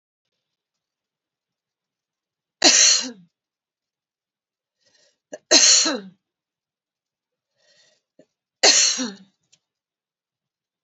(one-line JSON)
{"three_cough_length": "10.8 s", "three_cough_amplitude": 32768, "three_cough_signal_mean_std_ratio": 0.27, "survey_phase": "beta (2021-08-13 to 2022-03-07)", "age": "45-64", "gender": "Female", "wearing_mask": "No", "symptom_runny_or_blocked_nose": true, "symptom_fatigue": true, "symptom_other": true, "symptom_onset": "3 days", "smoker_status": "Current smoker (e-cigarettes or vapes only)", "respiratory_condition_asthma": false, "respiratory_condition_other": false, "recruitment_source": "Test and Trace", "submission_delay": "2 days", "covid_test_result": "Positive", "covid_test_method": "RT-qPCR", "covid_ct_value": 24.9, "covid_ct_gene": "N gene"}